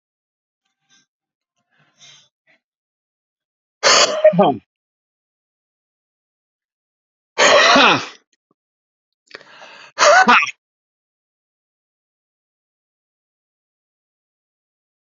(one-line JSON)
{"exhalation_length": "15.0 s", "exhalation_amplitude": 31329, "exhalation_signal_mean_std_ratio": 0.27, "survey_phase": "alpha (2021-03-01 to 2021-08-12)", "age": "45-64", "gender": "Male", "wearing_mask": "No", "symptom_cough_any": true, "symptom_fatigue": true, "symptom_fever_high_temperature": true, "symptom_change_to_sense_of_smell_or_taste": true, "symptom_onset": "5 days", "smoker_status": "Never smoked", "respiratory_condition_asthma": false, "respiratory_condition_other": false, "recruitment_source": "Test and Trace", "submission_delay": "2 days", "covid_test_result": "Positive", "covid_test_method": "RT-qPCR", "covid_ct_value": 11.7, "covid_ct_gene": "ORF1ab gene", "covid_ct_mean": 11.9, "covid_viral_load": "120000000 copies/ml", "covid_viral_load_category": "High viral load (>1M copies/ml)"}